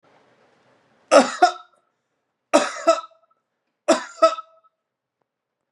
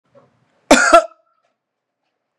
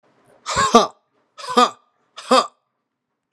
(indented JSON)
{
  "three_cough_length": "5.7 s",
  "three_cough_amplitude": 30578,
  "three_cough_signal_mean_std_ratio": 0.28,
  "cough_length": "2.4 s",
  "cough_amplitude": 32768,
  "cough_signal_mean_std_ratio": 0.28,
  "exhalation_length": "3.3 s",
  "exhalation_amplitude": 32768,
  "exhalation_signal_mean_std_ratio": 0.34,
  "survey_phase": "beta (2021-08-13 to 2022-03-07)",
  "age": "18-44",
  "gender": "Male",
  "wearing_mask": "No",
  "symptom_fatigue": true,
  "symptom_onset": "7 days",
  "smoker_status": "Never smoked",
  "respiratory_condition_asthma": false,
  "respiratory_condition_other": false,
  "recruitment_source": "REACT",
  "submission_delay": "1 day",
  "covid_test_result": "Positive",
  "covid_test_method": "RT-qPCR",
  "covid_ct_value": 27.0,
  "covid_ct_gene": "E gene",
  "influenza_a_test_result": "Negative",
  "influenza_b_test_result": "Negative"
}